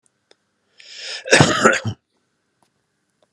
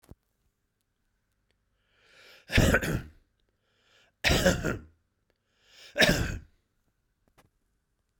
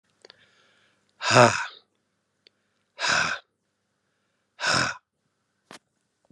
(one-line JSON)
{"cough_length": "3.3 s", "cough_amplitude": 32768, "cough_signal_mean_std_ratio": 0.32, "three_cough_length": "8.2 s", "three_cough_amplitude": 16762, "three_cough_signal_mean_std_ratio": 0.31, "exhalation_length": "6.3 s", "exhalation_amplitude": 31493, "exhalation_signal_mean_std_ratio": 0.29, "survey_phase": "beta (2021-08-13 to 2022-03-07)", "age": "45-64", "gender": "Male", "wearing_mask": "No", "symptom_none": true, "smoker_status": "Ex-smoker", "respiratory_condition_asthma": false, "respiratory_condition_other": false, "recruitment_source": "REACT", "submission_delay": "1 day", "covid_test_result": "Negative", "covid_test_method": "RT-qPCR"}